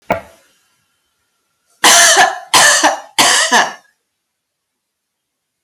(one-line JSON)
{"three_cough_length": "5.6 s", "three_cough_amplitude": 32768, "three_cough_signal_mean_std_ratio": 0.45, "survey_phase": "alpha (2021-03-01 to 2021-08-12)", "age": "45-64", "gender": "Female", "wearing_mask": "No", "symptom_none": true, "smoker_status": "Ex-smoker", "respiratory_condition_asthma": false, "respiratory_condition_other": false, "recruitment_source": "REACT", "submission_delay": "1 day", "covid_test_result": "Negative", "covid_test_method": "RT-qPCR"}